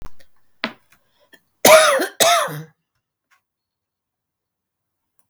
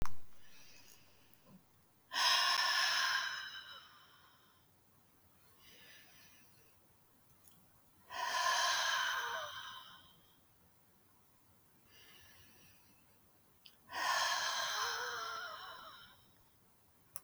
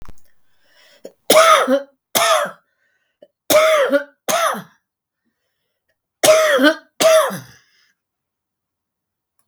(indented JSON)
{
  "cough_length": "5.3 s",
  "cough_amplitude": 32768,
  "cough_signal_mean_std_ratio": 0.31,
  "exhalation_length": "17.2 s",
  "exhalation_amplitude": 3584,
  "exhalation_signal_mean_std_ratio": 0.48,
  "three_cough_length": "9.5 s",
  "three_cough_amplitude": 32768,
  "three_cough_signal_mean_std_ratio": 0.44,
  "survey_phase": "beta (2021-08-13 to 2022-03-07)",
  "age": "65+",
  "gender": "Female",
  "wearing_mask": "No",
  "symptom_cough_any": true,
  "smoker_status": "Ex-smoker",
  "respiratory_condition_asthma": true,
  "respiratory_condition_other": false,
  "recruitment_source": "REACT",
  "submission_delay": "1 day",
  "covid_test_result": "Negative",
  "covid_test_method": "RT-qPCR",
  "influenza_a_test_result": "Negative",
  "influenza_b_test_result": "Negative"
}